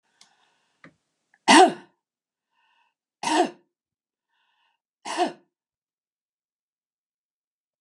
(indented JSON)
{
  "three_cough_length": "7.8 s",
  "three_cough_amplitude": 27957,
  "three_cough_signal_mean_std_ratio": 0.2,
  "survey_phase": "beta (2021-08-13 to 2022-03-07)",
  "age": "65+",
  "gender": "Female",
  "wearing_mask": "No",
  "symptom_none": true,
  "smoker_status": "Never smoked",
  "respiratory_condition_asthma": false,
  "respiratory_condition_other": false,
  "recruitment_source": "REACT",
  "submission_delay": "1 day",
  "covid_test_result": "Negative",
  "covid_test_method": "RT-qPCR",
  "influenza_a_test_result": "Negative",
  "influenza_b_test_result": "Negative"
}